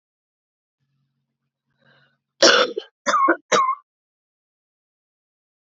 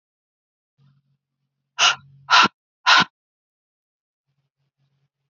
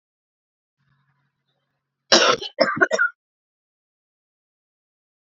{
  "three_cough_length": "5.6 s",
  "three_cough_amplitude": 30582,
  "three_cough_signal_mean_std_ratio": 0.3,
  "exhalation_length": "5.3 s",
  "exhalation_amplitude": 27272,
  "exhalation_signal_mean_std_ratio": 0.24,
  "cough_length": "5.2 s",
  "cough_amplitude": 30720,
  "cough_signal_mean_std_ratio": 0.27,
  "survey_phase": "beta (2021-08-13 to 2022-03-07)",
  "age": "18-44",
  "gender": "Female",
  "wearing_mask": "No",
  "symptom_cough_any": true,
  "symptom_runny_or_blocked_nose": true,
  "symptom_shortness_of_breath": true,
  "symptom_sore_throat": true,
  "symptom_fatigue": true,
  "symptom_headache": true,
  "symptom_onset": "2 days",
  "smoker_status": "Never smoked",
  "respiratory_condition_asthma": true,
  "respiratory_condition_other": false,
  "recruitment_source": "Test and Trace",
  "submission_delay": "2 days",
  "covid_test_result": "Positive",
  "covid_test_method": "ePCR"
}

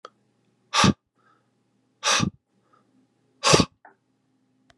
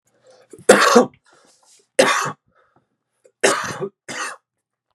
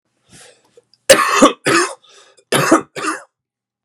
{
  "exhalation_length": "4.8 s",
  "exhalation_amplitude": 30351,
  "exhalation_signal_mean_std_ratio": 0.28,
  "three_cough_length": "4.9 s",
  "three_cough_amplitude": 32768,
  "three_cough_signal_mean_std_ratio": 0.34,
  "cough_length": "3.8 s",
  "cough_amplitude": 32768,
  "cough_signal_mean_std_ratio": 0.41,
  "survey_phase": "beta (2021-08-13 to 2022-03-07)",
  "age": "45-64",
  "gender": "Male",
  "wearing_mask": "No",
  "symptom_cough_any": true,
  "symptom_fatigue": true,
  "symptom_headache": true,
  "symptom_onset": "8 days",
  "smoker_status": "Never smoked",
  "respiratory_condition_asthma": false,
  "respiratory_condition_other": false,
  "recruitment_source": "Test and Trace",
  "submission_delay": "1 day",
  "covid_test_result": "Negative",
  "covid_test_method": "RT-qPCR"
}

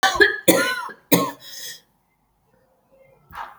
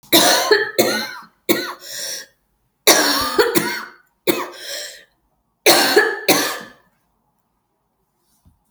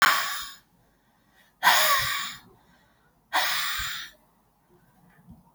{
  "cough_length": "3.6 s",
  "cough_amplitude": 32768,
  "cough_signal_mean_std_ratio": 0.39,
  "three_cough_length": "8.7 s",
  "three_cough_amplitude": 32768,
  "three_cough_signal_mean_std_ratio": 0.48,
  "exhalation_length": "5.5 s",
  "exhalation_amplitude": 17393,
  "exhalation_signal_mean_std_ratio": 0.44,
  "survey_phase": "beta (2021-08-13 to 2022-03-07)",
  "age": "18-44",
  "gender": "Female",
  "wearing_mask": "No",
  "symptom_new_continuous_cough": true,
  "symptom_runny_or_blocked_nose": true,
  "symptom_sore_throat": true,
  "symptom_fatigue": true,
  "smoker_status": "Ex-smoker",
  "respiratory_condition_asthma": false,
  "respiratory_condition_other": false,
  "recruitment_source": "Test and Trace",
  "submission_delay": "3 days",
  "covid_test_result": "Positive",
  "covid_test_method": "RT-qPCR",
  "covid_ct_value": 28.2,
  "covid_ct_gene": "ORF1ab gene",
  "covid_ct_mean": 29.1,
  "covid_viral_load": "280 copies/ml",
  "covid_viral_load_category": "Minimal viral load (< 10K copies/ml)"
}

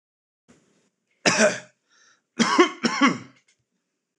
{
  "cough_length": "4.2 s",
  "cough_amplitude": 24822,
  "cough_signal_mean_std_ratio": 0.35,
  "survey_phase": "alpha (2021-03-01 to 2021-08-12)",
  "age": "18-44",
  "gender": "Male",
  "wearing_mask": "No",
  "symptom_none": true,
  "smoker_status": "Never smoked",
  "respiratory_condition_asthma": false,
  "respiratory_condition_other": false,
  "recruitment_source": "REACT",
  "submission_delay": "4 days",
  "covid_test_result": "Negative",
  "covid_test_method": "RT-qPCR"
}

